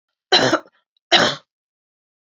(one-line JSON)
{"three_cough_length": "2.4 s", "three_cough_amplitude": 30563, "three_cough_signal_mean_std_ratio": 0.35, "survey_phase": "beta (2021-08-13 to 2022-03-07)", "age": "65+", "gender": "Female", "wearing_mask": "No", "symptom_cough_any": true, "symptom_fatigue": true, "symptom_headache": true, "smoker_status": "Never smoked", "respiratory_condition_asthma": false, "respiratory_condition_other": false, "recruitment_source": "Test and Trace", "submission_delay": "2 days", "covid_test_result": "Positive", "covid_test_method": "RT-qPCR", "covid_ct_value": 27.5, "covid_ct_gene": "ORF1ab gene"}